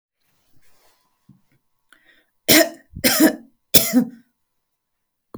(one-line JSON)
{"three_cough_length": "5.4 s", "three_cough_amplitude": 32768, "three_cough_signal_mean_std_ratio": 0.29, "survey_phase": "beta (2021-08-13 to 2022-03-07)", "age": "45-64", "gender": "Female", "wearing_mask": "No", "symptom_none": true, "smoker_status": "Never smoked", "respiratory_condition_asthma": false, "respiratory_condition_other": false, "recruitment_source": "REACT", "submission_delay": "3 days", "covid_test_result": "Negative", "covid_test_method": "RT-qPCR"}